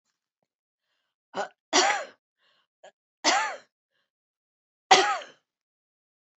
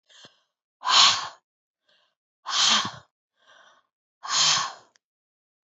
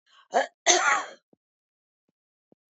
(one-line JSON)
{"three_cough_length": "6.4 s", "three_cough_amplitude": 27323, "three_cough_signal_mean_std_ratio": 0.28, "exhalation_length": "5.6 s", "exhalation_amplitude": 24534, "exhalation_signal_mean_std_ratio": 0.36, "cough_length": "2.7 s", "cough_amplitude": 17766, "cough_signal_mean_std_ratio": 0.33, "survey_phase": "beta (2021-08-13 to 2022-03-07)", "age": "65+", "gender": "Female", "wearing_mask": "No", "symptom_none": true, "smoker_status": "Never smoked", "respiratory_condition_asthma": false, "respiratory_condition_other": false, "recruitment_source": "REACT", "submission_delay": "3 days", "covid_test_result": "Negative", "covid_test_method": "RT-qPCR"}